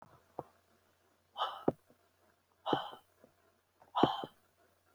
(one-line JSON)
{"exhalation_length": "4.9 s", "exhalation_amplitude": 7435, "exhalation_signal_mean_std_ratio": 0.27, "survey_phase": "beta (2021-08-13 to 2022-03-07)", "age": "45-64", "gender": "Female", "wearing_mask": "No", "symptom_none": true, "smoker_status": "Never smoked", "respiratory_condition_asthma": false, "respiratory_condition_other": false, "recruitment_source": "REACT", "submission_delay": "5 days", "covid_test_result": "Negative", "covid_test_method": "RT-qPCR"}